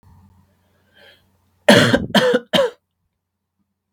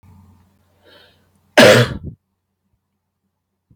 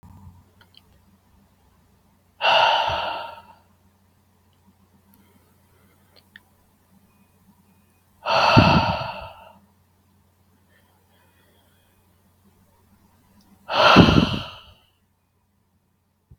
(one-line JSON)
{"three_cough_length": "3.9 s", "three_cough_amplitude": 32768, "three_cough_signal_mean_std_ratio": 0.35, "cough_length": "3.8 s", "cough_amplitude": 32768, "cough_signal_mean_std_ratio": 0.25, "exhalation_length": "16.4 s", "exhalation_amplitude": 32768, "exhalation_signal_mean_std_ratio": 0.29, "survey_phase": "beta (2021-08-13 to 2022-03-07)", "age": "18-44", "gender": "Male", "wearing_mask": "No", "symptom_runny_or_blocked_nose": true, "smoker_status": "Never smoked", "respiratory_condition_asthma": true, "respiratory_condition_other": false, "recruitment_source": "REACT", "submission_delay": "0 days", "covid_test_result": "Negative", "covid_test_method": "RT-qPCR", "influenza_a_test_result": "Negative", "influenza_b_test_result": "Negative"}